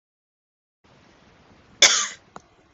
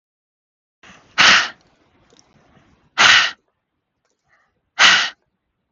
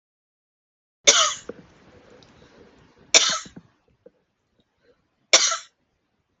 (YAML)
cough_length: 2.7 s
cough_amplitude: 32768
cough_signal_mean_std_ratio: 0.22
exhalation_length: 5.7 s
exhalation_amplitude: 32768
exhalation_signal_mean_std_ratio: 0.32
three_cough_length: 6.4 s
three_cough_amplitude: 32768
three_cough_signal_mean_std_ratio: 0.25
survey_phase: beta (2021-08-13 to 2022-03-07)
age: 18-44
gender: Female
wearing_mask: 'No'
symptom_cough_any: true
symptom_onset: 12 days
smoker_status: Never smoked
respiratory_condition_asthma: true
respiratory_condition_other: false
recruitment_source: REACT
submission_delay: 0 days
covid_test_result: Negative
covid_test_method: RT-qPCR
influenza_a_test_result: Negative
influenza_b_test_result: Negative